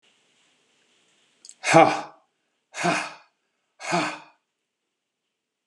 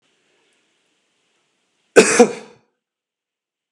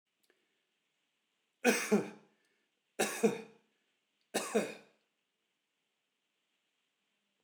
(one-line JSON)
{"exhalation_length": "5.7 s", "exhalation_amplitude": 31774, "exhalation_signal_mean_std_ratio": 0.27, "cough_length": "3.7 s", "cough_amplitude": 32768, "cough_signal_mean_std_ratio": 0.21, "three_cough_length": "7.4 s", "three_cough_amplitude": 7125, "three_cough_signal_mean_std_ratio": 0.27, "survey_phase": "beta (2021-08-13 to 2022-03-07)", "age": "45-64", "gender": "Male", "wearing_mask": "No", "symptom_none": true, "smoker_status": "Never smoked", "respiratory_condition_asthma": false, "respiratory_condition_other": false, "recruitment_source": "REACT", "submission_delay": "14 days", "covid_test_result": "Negative", "covid_test_method": "RT-qPCR"}